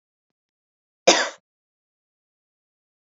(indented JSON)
{
  "cough_length": "3.1 s",
  "cough_amplitude": 28622,
  "cough_signal_mean_std_ratio": 0.18,
  "survey_phase": "beta (2021-08-13 to 2022-03-07)",
  "age": "18-44",
  "gender": "Female",
  "wearing_mask": "No",
  "symptom_cough_any": true,
  "symptom_runny_or_blocked_nose": true,
  "symptom_sore_throat": true,
  "symptom_fatigue": true,
  "symptom_onset": "2 days",
  "smoker_status": "Never smoked",
  "respiratory_condition_asthma": false,
  "respiratory_condition_other": false,
  "recruitment_source": "Test and Trace",
  "submission_delay": "1 day",
  "covid_test_result": "Positive",
  "covid_test_method": "RT-qPCR",
  "covid_ct_value": 24.3,
  "covid_ct_gene": "ORF1ab gene",
  "covid_ct_mean": 24.7,
  "covid_viral_load": "8100 copies/ml",
  "covid_viral_load_category": "Minimal viral load (< 10K copies/ml)"
}